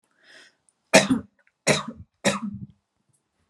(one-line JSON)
{"three_cough_length": "3.5 s", "three_cough_amplitude": 32510, "three_cough_signal_mean_std_ratio": 0.31, "survey_phase": "alpha (2021-03-01 to 2021-08-12)", "age": "18-44", "gender": "Female", "wearing_mask": "No", "symptom_fatigue": true, "symptom_headache": true, "symptom_onset": "13 days", "smoker_status": "Never smoked", "respiratory_condition_asthma": false, "respiratory_condition_other": false, "recruitment_source": "REACT", "submission_delay": "1 day", "covid_test_result": "Negative", "covid_test_method": "RT-qPCR"}